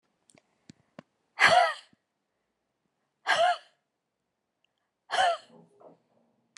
{"exhalation_length": "6.6 s", "exhalation_amplitude": 14904, "exhalation_signal_mean_std_ratio": 0.3, "survey_phase": "alpha (2021-03-01 to 2021-08-12)", "age": "45-64", "gender": "Female", "wearing_mask": "No", "symptom_none": true, "smoker_status": "Never smoked", "respiratory_condition_asthma": false, "respiratory_condition_other": false, "recruitment_source": "REACT", "submission_delay": "1 day", "covid_test_result": "Negative", "covid_test_method": "RT-qPCR"}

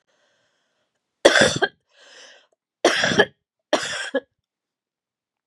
{"three_cough_length": "5.5 s", "three_cough_amplitude": 32768, "three_cough_signal_mean_std_ratio": 0.32, "survey_phase": "beta (2021-08-13 to 2022-03-07)", "age": "45-64", "gender": "Female", "wearing_mask": "No", "symptom_cough_any": true, "symptom_loss_of_taste": true, "smoker_status": "Never smoked", "respiratory_condition_asthma": false, "respiratory_condition_other": false, "recruitment_source": "REACT", "submission_delay": "1 day", "covid_test_result": "Negative", "covid_test_method": "RT-qPCR", "influenza_a_test_result": "Negative", "influenza_b_test_result": "Negative"}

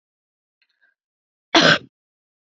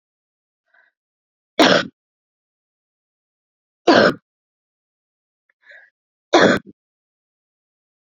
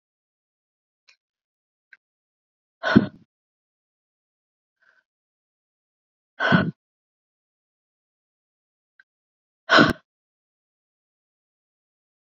{"cough_length": "2.6 s", "cough_amplitude": 29702, "cough_signal_mean_std_ratio": 0.24, "three_cough_length": "8.0 s", "three_cough_amplitude": 30147, "three_cough_signal_mean_std_ratio": 0.24, "exhalation_length": "12.3 s", "exhalation_amplitude": 27431, "exhalation_signal_mean_std_ratio": 0.17, "survey_phase": "beta (2021-08-13 to 2022-03-07)", "age": "45-64", "gender": "Female", "wearing_mask": "No", "symptom_cough_any": true, "symptom_new_continuous_cough": true, "symptom_sore_throat": true, "symptom_fatigue": true, "symptom_onset": "3 days", "smoker_status": "Never smoked", "respiratory_condition_asthma": false, "respiratory_condition_other": false, "recruitment_source": "Test and Trace", "submission_delay": "2 days", "covid_test_result": "Positive", "covid_test_method": "RT-qPCR", "covid_ct_value": 12.4, "covid_ct_gene": "ORF1ab gene", "covid_ct_mean": 12.7, "covid_viral_load": "70000000 copies/ml", "covid_viral_load_category": "High viral load (>1M copies/ml)"}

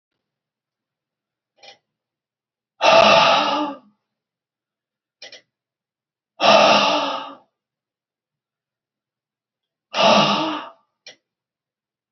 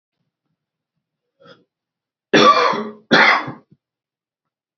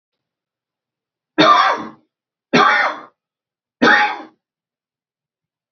{"exhalation_length": "12.1 s", "exhalation_amplitude": 32643, "exhalation_signal_mean_std_ratio": 0.34, "cough_length": "4.8 s", "cough_amplitude": 31830, "cough_signal_mean_std_ratio": 0.33, "three_cough_length": "5.7 s", "three_cough_amplitude": 31092, "three_cough_signal_mean_std_ratio": 0.37, "survey_phase": "beta (2021-08-13 to 2022-03-07)", "age": "65+", "gender": "Male", "wearing_mask": "No", "symptom_none": true, "smoker_status": "Never smoked", "respiratory_condition_asthma": false, "respiratory_condition_other": false, "recruitment_source": "REACT", "submission_delay": "7 days", "covid_test_result": "Negative", "covid_test_method": "RT-qPCR", "influenza_a_test_result": "Negative", "influenza_b_test_result": "Negative"}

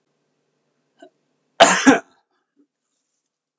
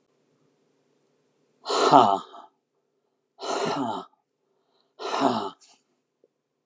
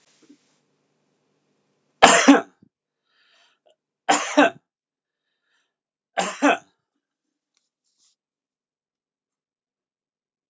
{"cough_length": "3.6 s", "cough_amplitude": 32768, "cough_signal_mean_std_ratio": 0.23, "exhalation_length": "6.7 s", "exhalation_amplitude": 30843, "exhalation_signal_mean_std_ratio": 0.32, "three_cough_length": "10.5 s", "three_cough_amplitude": 32768, "three_cough_signal_mean_std_ratio": 0.22, "survey_phase": "beta (2021-08-13 to 2022-03-07)", "age": "65+", "gender": "Male", "wearing_mask": "No", "symptom_none": true, "smoker_status": "Never smoked", "respiratory_condition_asthma": false, "respiratory_condition_other": false, "recruitment_source": "REACT", "submission_delay": "3 days", "covid_test_result": "Negative", "covid_test_method": "RT-qPCR", "influenza_a_test_result": "Negative", "influenza_b_test_result": "Negative"}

